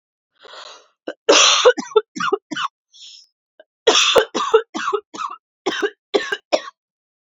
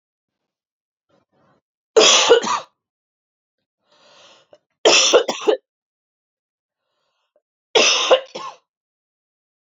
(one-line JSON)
{"cough_length": "7.3 s", "cough_amplitude": 32768, "cough_signal_mean_std_ratio": 0.42, "three_cough_length": "9.6 s", "three_cough_amplitude": 32768, "three_cough_signal_mean_std_ratio": 0.32, "survey_phase": "alpha (2021-03-01 to 2021-08-12)", "age": "18-44", "gender": "Female", "wearing_mask": "No", "symptom_cough_any": true, "symptom_change_to_sense_of_smell_or_taste": true, "smoker_status": "Never smoked", "respiratory_condition_asthma": false, "respiratory_condition_other": false, "recruitment_source": "Test and Trace", "submission_delay": "2 days", "covid_test_result": "Positive", "covid_test_method": "RT-qPCR", "covid_ct_value": 28.9, "covid_ct_gene": "N gene", "covid_ct_mean": 29.3, "covid_viral_load": "240 copies/ml", "covid_viral_load_category": "Minimal viral load (< 10K copies/ml)"}